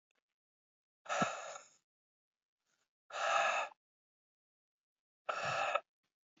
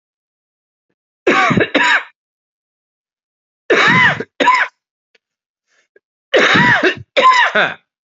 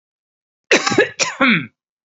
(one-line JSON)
{"exhalation_length": "6.4 s", "exhalation_amplitude": 4026, "exhalation_signal_mean_std_ratio": 0.37, "three_cough_length": "8.1 s", "three_cough_amplitude": 32767, "three_cough_signal_mean_std_ratio": 0.48, "cough_length": "2.0 s", "cough_amplitude": 32767, "cough_signal_mean_std_ratio": 0.45, "survey_phase": "beta (2021-08-13 to 2022-03-07)", "age": "18-44", "gender": "Male", "wearing_mask": "No", "symptom_none": true, "smoker_status": "Never smoked", "respiratory_condition_asthma": false, "respiratory_condition_other": false, "recruitment_source": "Test and Trace", "submission_delay": "0 days", "covid_test_result": "Negative", "covid_test_method": "LFT"}